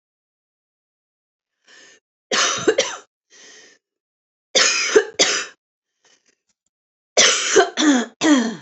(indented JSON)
{
  "three_cough_length": "8.6 s",
  "three_cough_amplitude": 32767,
  "three_cough_signal_mean_std_ratio": 0.42,
  "survey_phase": "alpha (2021-03-01 to 2021-08-12)",
  "age": "45-64",
  "gender": "Female",
  "wearing_mask": "No",
  "symptom_cough_any": true,
  "smoker_status": "Never smoked",
  "respiratory_condition_asthma": false,
  "respiratory_condition_other": false,
  "recruitment_source": "Test and Trace",
  "submission_delay": "2 days",
  "covid_test_result": "Positive",
  "covid_test_method": "RT-qPCR",
  "covid_ct_value": 19.9,
  "covid_ct_gene": "ORF1ab gene",
  "covid_ct_mean": 20.8,
  "covid_viral_load": "150000 copies/ml",
  "covid_viral_load_category": "Low viral load (10K-1M copies/ml)"
}